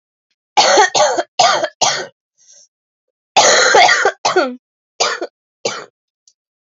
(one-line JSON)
{"three_cough_length": "6.7 s", "three_cough_amplitude": 32768, "three_cough_signal_mean_std_ratio": 0.5, "survey_phase": "alpha (2021-03-01 to 2021-08-12)", "age": "18-44", "gender": "Female", "wearing_mask": "No", "symptom_new_continuous_cough": true, "symptom_shortness_of_breath": true, "symptom_fatigue": true, "symptom_headache": true, "symptom_onset": "6 days", "smoker_status": "Never smoked", "respiratory_condition_asthma": true, "respiratory_condition_other": false, "recruitment_source": "Test and Trace", "submission_delay": "2 days", "covid_test_result": "Positive", "covid_test_method": "RT-qPCR", "covid_ct_value": 36.4, "covid_ct_gene": "N gene"}